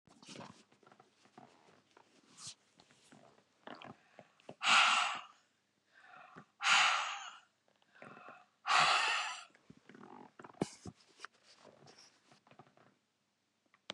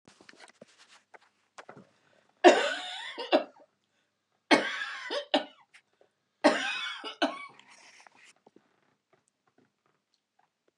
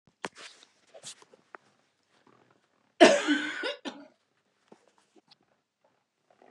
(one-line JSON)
{"exhalation_length": "13.9 s", "exhalation_amplitude": 6536, "exhalation_signal_mean_std_ratio": 0.32, "three_cough_length": "10.8 s", "three_cough_amplitude": 21882, "three_cough_signal_mean_std_ratio": 0.27, "cough_length": "6.5 s", "cough_amplitude": 22959, "cough_signal_mean_std_ratio": 0.21, "survey_phase": "beta (2021-08-13 to 2022-03-07)", "age": "65+", "gender": "Female", "wearing_mask": "No", "symptom_none": true, "smoker_status": "Never smoked", "respiratory_condition_asthma": false, "respiratory_condition_other": false, "recruitment_source": "REACT", "submission_delay": "2 days", "covid_test_result": "Negative", "covid_test_method": "RT-qPCR", "influenza_a_test_result": "Negative", "influenza_b_test_result": "Negative"}